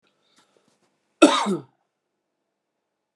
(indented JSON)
{
  "cough_length": "3.2 s",
  "cough_amplitude": 31974,
  "cough_signal_mean_std_ratio": 0.22,
  "survey_phase": "beta (2021-08-13 to 2022-03-07)",
  "age": "45-64",
  "gender": "Male",
  "wearing_mask": "No",
  "symptom_fatigue": true,
  "symptom_onset": "9 days",
  "smoker_status": "Current smoker (1 to 10 cigarettes per day)",
  "respiratory_condition_asthma": false,
  "respiratory_condition_other": false,
  "recruitment_source": "REACT",
  "submission_delay": "1 day",
  "covid_test_result": "Negative",
  "covid_test_method": "RT-qPCR"
}